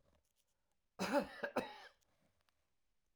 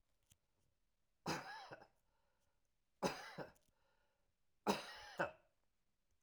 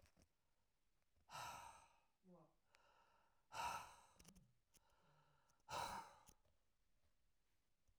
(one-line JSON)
{"cough_length": "3.2 s", "cough_amplitude": 2125, "cough_signal_mean_std_ratio": 0.32, "three_cough_length": "6.2 s", "three_cough_amplitude": 2690, "three_cough_signal_mean_std_ratio": 0.31, "exhalation_length": "8.0 s", "exhalation_amplitude": 553, "exhalation_signal_mean_std_ratio": 0.39, "survey_phase": "alpha (2021-03-01 to 2021-08-12)", "age": "65+", "gender": "Male", "wearing_mask": "No", "symptom_none": true, "smoker_status": "Ex-smoker", "respiratory_condition_asthma": false, "respiratory_condition_other": false, "recruitment_source": "REACT", "submission_delay": "2 days", "covid_test_result": "Negative", "covid_test_method": "RT-qPCR"}